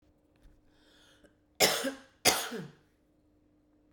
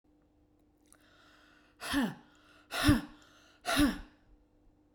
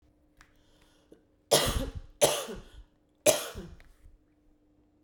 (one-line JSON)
{"cough_length": "3.9 s", "cough_amplitude": 14276, "cough_signal_mean_std_ratio": 0.3, "exhalation_length": "4.9 s", "exhalation_amplitude": 7479, "exhalation_signal_mean_std_ratio": 0.34, "three_cough_length": "5.0 s", "three_cough_amplitude": 15885, "three_cough_signal_mean_std_ratio": 0.33, "survey_phase": "beta (2021-08-13 to 2022-03-07)", "age": "45-64", "gender": "Female", "wearing_mask": "No", "symptom_none": true, "smoker_status": "Never smoked", "respiratory_condition_asthma": false, "respiratory_condition_other": false, "recruitment_source": "REACT", "submission_delay": "1 day", "covid_test_result": "Negative", "covid_test_method": "RT-qPCR"}